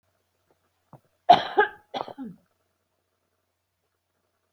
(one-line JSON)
{"cough_length": "4.5 s", "cough_amplitude": 24739, "cough_signal_mean_std_ratio": 0.19, "survey_phase": "beta (2021-08-13 to 2022-03-07)", "age": "45-64", "gender": "Female", "wearing_mask": "No", "symptom_none": true, "smoker_status": "Never smoked", "respiratory_condition_asthma": false, "respiratory_condition_other": false, "recruitment_source": "REACT", "submission_delay": "5 days", "covid_test_result": "Negative", "covid_test_method": "RT-qPCR"}